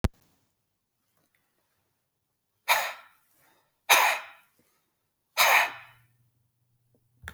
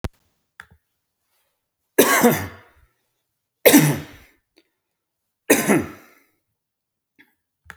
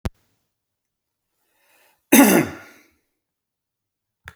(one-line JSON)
{"exhalation_length": "7.3 s", "exhalation_amplitude": 23076, "exhalation_signal_mean_std_ratio": 0.27, "three_cough_length": "7.8 s", "three_cough_amplitude": 32768, "three_cough_signal_mean_std_ratio": 0.29, "cough_length": "4.4 s", "cough_amplitude": 32768, "cough_signal_mean_std_ratio": 0.23, "survey_phase": "beta (2021-08-13 to 2022-03-07)", "age": "45-64", "gender": "Male", "wearing_mask": "No", "symptom_none": true, "smoker_status": "Ex-smoker", "respiratory_condition_asthma": false, "respiratory_condition_other": false, "recruitment_source": "REACT", "submission_delay": "3 days", "covid_test_result": "Negative", "covid_test_method": "RT-qPCR", "influenza_a_test_result": "Negative", "influenza_b_test_result": "Negative"}